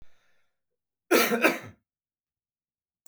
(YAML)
cough_length: 3.1 s
cough_amplitude: 14793
cough_signal_mean_std_ratio: 0.3
survey_phase: beta (2021-08-13 to 2022-03-07)
age: 18-44
gender: Male
wearing_mask: 'No'
symptom_cough_any: true
symptom_runny_or_blocked_nose: true
smoker_status: Ex-smoker
respiratory_condition_asthma: false
respiratory_condition_other: false
recruitment_source: REACT
submission_delay: 3 days
covid_test_result: Negative
covid_test_method: RT-qPCR
covid_ct_value: 38.0
covid_ct_gene: N gene
influenza_a_test_result: Negative
influenza_b_test_result: Negative